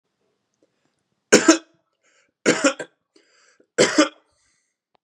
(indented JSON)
{
  "three_cough_length": "5.0 s",
  "three_cough_amplitude": 32767,
  "three_cough_signal_mean_std_ratio": 0.28,
  "survey_phase": "beta (2021-08-13 to 2022-03-07)",
  "age": "18-44",
  "gender": "Male",
  "wearing_mask": "No",
  "symptom_cough_any": true,
  "symptom_sore_throat": true,
  "symptom_fatigue": true,
  "symptom_fever_high_temperature": true,
  "symptom_headache": true,
  "symptom_onset": "3 days",
  "smoker_status": "Never smoked",
  "respiratory_condition_asthma": false,
  "respiratory_condition_other": false,
  "recruitment_source": "Test and Trace",
  "submission_delay": "1 day",
  "covid_test_result": "Positive",
  "covid_test_method": "RT-qPCR"
}